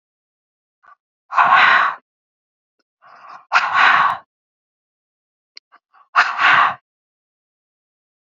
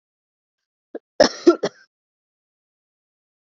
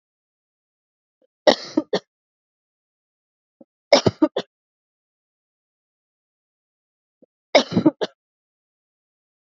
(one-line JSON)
{"exhalation_length": "8.4 s", "exhalation_amplitude": 31618, "exhalation_signal_mean_std_ratio": 0.37, "cough_length": "3.4 s", "cough_amplitude": 29018, "cough_signal_mean_std_ratio": 0.19, "three_cough_length": "9.6 s", "three_cough_amplitude": 31179, "three_cough_signal_mean_std_ratio": 0.19, "survey_phase": "beta (2021-08-13 to 2022-03-07)", "age": "18-44", "gender": "Female", "wearing_mask": "No", "symptom_cough_any": true, "symptom_runny_or_blocked_nose": true, "symptom_sore_throat": true, "symptom_fatigue": true, "symptom_fever_high_temperature": true, "symptom_headache": true, "symptom_onset": "3 days", "smoker_status": "Never smoked", "respiratory_condition_asthma": false, "respiratory_condition_other": false, "recruitment_source": "Test and Trace", "submission_delay": "2 days", "covid_test_result": "Positive", "covid_test_method": "ePCR"}